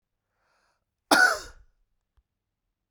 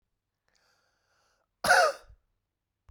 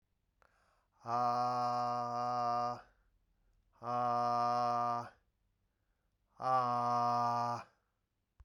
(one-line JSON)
{"cough_length": "2.9 s", "cough_amplitude": 20489, "cough_signal_mean_std_ratio": 0.24, "three_cough_length": "2.9 s", "three_cough_amplitude": 11733, "three_cough_signal_mean_std_ratio": 0.25, "exhalation_length": "8.4 s", "exhalation_amplitude": 2847, "exhalation_signal_mean_std_ratio": 0.66, "survey_phase": "beta (2021-08-13 to 2022-03-07)", "age": "45-64", "gender": "Male", "wearing_mask": "No", "symptom_none": true, "smoker_status": "Never smoked", "respiratory_condition_asthma": true, "respiratory_condition_other": false, "recruitment_source": "REACT", "submission_delay": "0 days", "covid_test_result": "Negative", "covid_test_method": "RT-qPCR"}